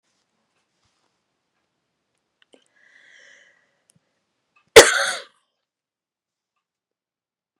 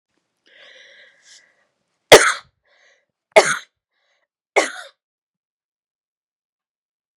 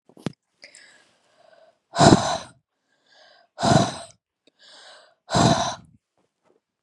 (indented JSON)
{
  "cough_length": "7.6 s",
  "cough_amplitude": 32768,
  "cough_signal_mean_std_ratio": 0.13,
  "three_cough_length": "7.2 s",
  "three_cough_amplitude": 32768,
  "three_cough_signal_mean_std_ratio": 0.18,
  "exhalation_length": "6.8 s",
  "exhalation_amplitude": 32767,
  "exhalation_signal_mean_std_ratio": 0.31,
  "survey_phase": "beta (2021-08-13 to 2022-03-07)",
  "age": "45-64",
  "gender": "Female",
  "wearing_mask": "No",
  "symptom_none": true,
  "smoker_status": "Never smoked",
  "respiratory_condition_asthma": false,
  "respiratory_condition_other": false,
  "recruitment_source": "REACT",
  "submission_delay": "2 days",
  "covid_test_result": "Negative",
  "covid_test_method": "RT-qPCR",
  "influenza_a_test_result": "Negative",
  "influenza_b_test_result": "Negative"
}